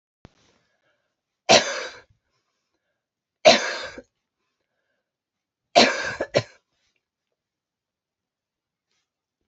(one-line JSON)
{"three_cough_length": "9.5 s", "three_cough_amplitude": 31772, "three_cough_signal_mean_std_ratio": 0.22, "survey_phase": "beta (2021-08-13 to 2022-03-07)", "age": "45-64", "gender": "Female", "wearing_mask": "No", "symptom_none": true, "smoker_status": "Never smoked", "respiratory_condition_asthma": false, "respiratory_condition_other": false, "recruitment_source": "REACT", "submission_delay": "3 days", "covid_test_result": "Negative", "covid_test_method": "RT-qPCR", "influenza_a_test_result": "Negative", "influenza_b_test_result": "Negative"}